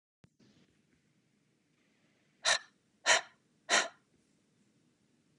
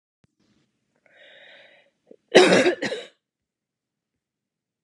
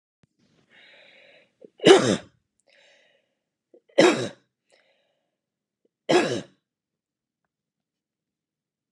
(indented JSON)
{
  "exhalation_length": "5.4 s",
  "exhalation_amplitude": 8192,
  "exhalation_signal_mean_std_ratio": 0.23,
  "cough_length": "4.8 s",
  "cough_amplitude": 31816,
  "cough_signal_mean_std_ratio": 0.25,
  "three_cough_length": "8.9 s",
  "three_cough_amplitude": 30075,
  "three_cough_signal_mean_std_ratio": 0.22,
  "survey_phase": "beta (2021-08-13 to 2022-03-07)",
  "age": "45-64",
  "gender": "Female",
  "wearing_mask": "No",
  "symptom_sore_throat": true,
  "smoker_status": "Never smoked",
  "respiratory_condition_asthma": true,
  "respiratory_condition_other": false,
  "recruitment_source": "Test and Trace",
  "submission_delay": "1 day",
  "covid_test_result": "Negative",
  "covid_test_method": "RT-qPCR"
}